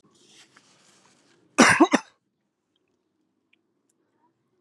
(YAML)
cough_length: 4.6 s
cough_amplitude: 31010
cough_signal_mean_std_ratio: 0.21
survey_phase: alpha (2021-03-01 to 2021-08-12)
age: 18-44
gender: Male
wearing_mask: 'Yes'
symptom_cough_any: true
symptom_new_continuous_cough: true
symptom_diarrhoea: true
symptom_fatigue: true
symptom_change_to_sense_of_smell_or_taste: true
symptom_onset: 4 days
smoker_status: Current smoker (11 or more cigarettes per day)
respiratory_condition_asthma: false
respiratory_condition_other: false
recruitment_source: Test and Trace
submission_delay: 2 days
covid_test_result: Positive
covid_test_method: RT-qPCR
covid_ct_value: 41.2
covid_ct_gene: N gene